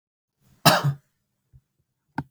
{"cough_length": "2.3 s", "cough_amplitude": 30476, "cough_signal_mean_std_ratio": 0.26, "survey_phase": "beta (2021-08-13 to 2022-03-07)", "age": "45-64", "gender": "Male", "wearing_mask": "No", "symptom_cough_any": true, "symptom_runny_or_blocked_nose": true, "smoker_status": "Never smoked", "respiratory_condition_asthma": false, "respiratory_condition_other": false, "recruitment_source": "REACT", "submission_delay": "1 day", "covid_test_result": "Negative", "covid_test_method": "RT-qPCR", "influenza_a_test_result": "Unknown/Void", "influenza_b_test_result": "Unknown/Void"}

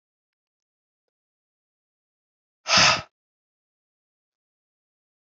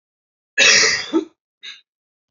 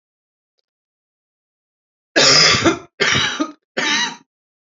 {"exhalation_length": "5.3 s", "exhalation_amplitude": 22012, "exhalation_signal_mean_std_ratio": 0.18, "cough_length": "2.3 s", "cough_amplitude": 31544, "cough_signal_mean_std_ratio": 0.41, "three_cough_length": "4.8 s", "three_cough_amplitude": 31964, "three_cough_signal_mean_std_ratio": 0.43, "survey_phase": "beta (2021-08-13 to 2022-03-07)", "age": "18-44", "gender": "Female", "wearing_mask": "No", "symptom_cough_any": true, "symptom_runny_or_blocked_nose": true, "symptom_change_to_sense_of_smell_or_taste": true, "symptom_onset": "4 days", "smoker_status": "Current smoker (11 or more cigarettes per day)", "respiratory_condition_asthma": false, "respiratory_condition_other": false, "recruitment_source": "Test and Trace", "submission_delay": "2 days", "covid_test_result": "Positive", "covid_test_method": "RT-qPCR", "covid_ct_value": 21.3, "covid_ct_gene": "ORF1ab gene"}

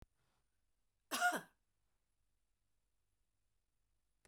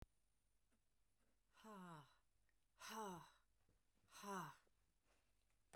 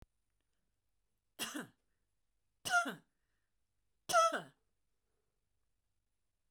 {"cough_length": "4.3 s", "cough_amplitude": 2262, "cough_signal_mean_std_ratio": 0.2, "exhalation_length": "5.8 s", "exhalation_amplitude": 335, "exhalation_signal_mean_std_ratio": 0.44, "three_cough_length": "6.5 s", "three_cough_amplitude": 3776, "three_cough_signal_mean_std_ratio": 0.25, "survey_phase": "beta (2021-08-13 to 2022-03-07)", "age": "65+", "gender": "Female", "wearing_mask": "No", "symptom_none": true, "smoker_status": "Never smoked", "respiratory_condition_asthma": true, "respiratory_condition_other": false, "recruitment_source": "REACT", "submission_delay": "1 day", "covid_test_result": "Negative", "covid_test_method": "RT-qPCR"}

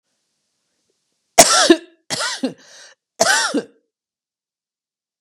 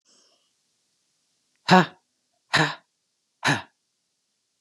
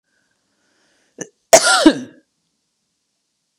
{"three_cough_length": "5.2 s", "three_cough_amplitude": 32768, "three_cough_signal_mean_std_ratio": 0.31, "exhalation_length": "4.6 s", "exhalation_amplitude": 28406, "exhalation_signal_mean_std_ratio": 0.23, "cough_length": "3.6 s", "cough_amplitude": 32768, "cough_signal_mean_std_ratio": 0.25, "survey_phase": "beta (2021-08-13 to 2022-03-07)", "age": "45-64", "gender": "Female", "wearing_mask": "No", "symptom_runny_or_blocked_nose": true, "symptom_sore_throat": true, "symptom_abdominal_pain": true, "symptom_fatigue": true, "symptom_headache": true, "symptom_change_to_sense_of_smell_or_taste": true, "symptom_loss_of_taste": true, "symptom_other": true, "symptom_onset": "4 days", "smoker_status": "Ex-smoker", "respiratory_condition_asthma": false, "respiratory_condition_other": false, "recruitment_source": "Test and Trace", "submission_delay": "2 days", "covid_test_result": "Positive", "covid_test_method": "RT-qPCR", "covid_ct_value": 28.7, "covid_ct_gene": "ORF1ab gene", "covid_ct_mean": 29.5, "covid_viral_load": "220 copies/ml", "covid_viral_load_category": "Minimal viral load (< 10K copies/ml)"}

